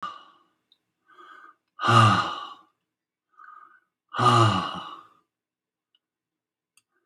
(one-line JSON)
{"exhalation_length": "7.1 s", "exhalation_amplitude": 19297, "exhalation_signal_mean_std_ratio": 0.33, "survey_phase": "alpha (2021-03-01 to 2021-08-12)", "age": "65+", "gender": "Male", "wearing_mask": "No", "symptom_none": true, "smoker_status": "Ex-smoker", "respiratory_condition_asthma": false, "respiratory_condition_other": false, "recruitment_source": "REACT", "submission_delay": "2 days", "covid_test_result": "Negative", "covid_test_method": "RT-qPCR"}